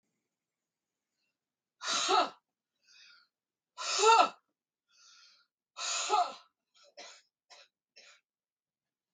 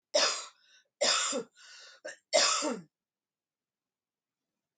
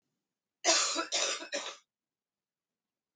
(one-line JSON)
{"exhalation_length": "9.1 s", "exhalation_amplitude": 9463, "exhalation_signal_mean_std_ratio": 0.29, "three_cough_length": "4.8 s", "three_cough_amplitude": 8446, "three_cough_signal_mean_std_ratio": 0.4, "cough_length": "3.2 s", "cough_amplitude": 7311, "cough_signal_mean_std_ratio": 0.41, "survey_phase": "beta (2021-08-13 to 2022-03-07)", "age": "45-64", "gender": "Female", "wearing_mask": "No", "symptom_cough_any": true, "symptom_runny_or_blocked_nose": true, "symptom_shortness_of_breath": true, "symptom_sore_throat": true, "symptom_fatigue": true, "symptom_headache": true, "symptom_change_to_sense_of_smell_or_taste": true, "symptom_loss_of_taste": true, "symptom_onset": "6 days", "smoker_status": "Ex-smoker", "respiratory_condition_asthma": false, "respiratory_condition_other": false, "recruitment_source": "Test and Trace", "submission_delay": "2 days", "covid_test_result": "Positive", "covid_test_method": "ePCR"}